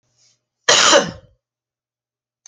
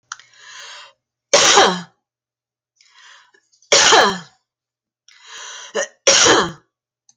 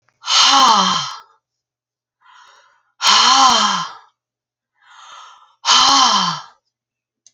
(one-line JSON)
{"cough_length": "2.5 s", "cough_amplitude": 32768, "cough_signal_mean_std_ratio": 0.32, "three_cough_length": "7.2 s", "three_cough_amplitude": 32767, "three_cough_signal_mean_std_ratio": 0.38, "exhalation_length": "7.3 s", "exhalation_amplitude": 32768, "exhalation_signal_mean_std_ratio": 0.49, "survey_phase": "alpha (2021-03-01 to 2021-08-12)", "age": "45-64", "gender": "Female", "wearing_mask": "No", "symptom_none": true, "smoker_status": "Never smoked", "respiratory_condition_asthma": false, "respiratory_condition_other": false, "recruitment_source": "REACT", "submission_delay": "4 days", "covid_test_result": "Negative", "covid_test_method": "RT-qPCR"}